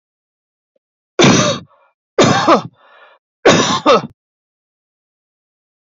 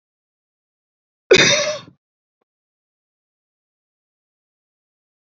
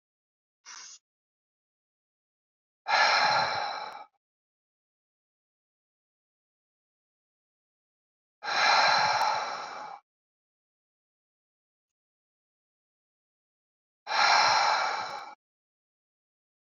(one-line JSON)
{"three_cough_length": "6.0 s", "three_cough_amplitude": 30095, "three_cough_signal_mean_std_ratio": 0.38, "cough_length": "5.4 s", "cough_amplitude": 31051, "cough_signal_mean_std_ratio": 0.21, "exhalation_length": "16.6 s", "exhalation_amplitude": 10981, "exhalation_signal_mean_std_ratio": 0.35, "survey_phase": "beta (2021-08-13 to 2022-03-07)", "age": "45-64", "gender": "Male", "wearing_mask": "No", "symptom_none": true, "smoker_status": "Current smoker (11 or more cigarettes per day)", "respiratory_condition_asthma": false, "respiratory_condition_other": false, "recruitment_source": "REACT", "submission_delay": "2 days", "covid_test_result": "Negative", "covid_test_method": "RT-qPCR", "influenza_a_test_result": "Negative", "influenza_b_test_result": "Negative"}